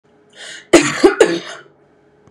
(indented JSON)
{
  "cough_length": "2.3 s",
  "cough_amplitude": 32768,
  "cough_signal_mean_std_ratio": 0.38,
  "survey_phase": "beta (2021-08-13 to 2022-03-07)",
  "age": "18-44",
  "gender": "Female",
  "wearing_mask": "No",
  "symptom_none": true,
  "smoker_status": "Never smoked",
  "respiratory_condition_asthma": false,
  "respiratory_condition_other": false,
  "recruitment_source": "REACT",
  "submission_delay": "0 days",
  "covid_test_result": "Negative",
  "covid_test_method": "RT-qPCR",
  "influenza_a_test_result": "Negative",
  "influenza_b_test_result": "Negative"
}